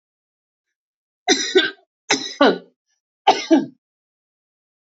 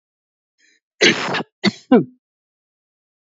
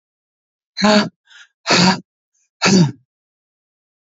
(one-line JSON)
{"three_cough_length": "4.9 s", "three_cough_amplitude": 32421, "three_cough_signal_mean_std_ratio": 0.32, "cough_length": "3.2 s", "cough_amplitude": 29224, "cough_signal_mean_std_ratio": 0.31, "exhalation_length": "4.2 s", "exhalation_amplitude": 29556, "exhalation_signal_mean_std_ratio": 0.38, "survey_phase": "beta (2021-08-13 to 2022-03-07)", "age": "45-64", "gender": "Female", "wearing_mask": "No", "symptom_none": true, "smoker_status": "Ex-smoker", "respiratory_condition_asthma": false, "respiratory_condition_other": false, "recruitment_source": "REACT", "submission_delay": "3 days", "covid_test_result": "Negative", "covid_test_method": "RT-qPCR", "influenza_a_test_result": "Unknown/Void", "influenza_b_test_result": "Unknown/Void"}